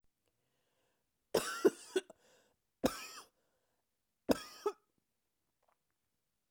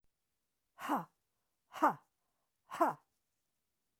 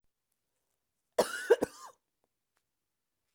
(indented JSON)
{
  "three_cough_length": "6.5 s",
  "three_cough_amplitude": 5739,
  "three_cough_signal_mean_std_ratio": 0.22,
  "exhalation_length": "4.0 s",
  "exhalation_amplitude": 4318,
  "exhalation_signal_mean_std_ratio": 0.27,
  "cough_length": "3.3 s",
  "cough_amplitude": 8901,
  "cough_signal_mean_std_ratio": 0.2,
  "survey_phase": "beta (2021-08-13 to 2022-03-07)",
  "age": "45-64",
  "gender": "Female",
  "wearing_mask": "No",
  "symptom_cough_any": true,
  "symptom_runny_or_blocked_nose": true,
  "symptom_sore_throat": true,
  "symptom_fatigue": true,
  "symptom_fever_high_temperature": true,
  "symptom_headache": true,
  "symptom_onset": "3 days",
  "smoker_status": "Never smoked",
  "respiratory_condition_asthma": true,
  "respiratory_condition_other": false,
  "recruitment_source": "Test and Trace",
  "submission_delay": "1 day",
  "covid_test_result": "Positive",
  "covid_test_method": "ePCR"
}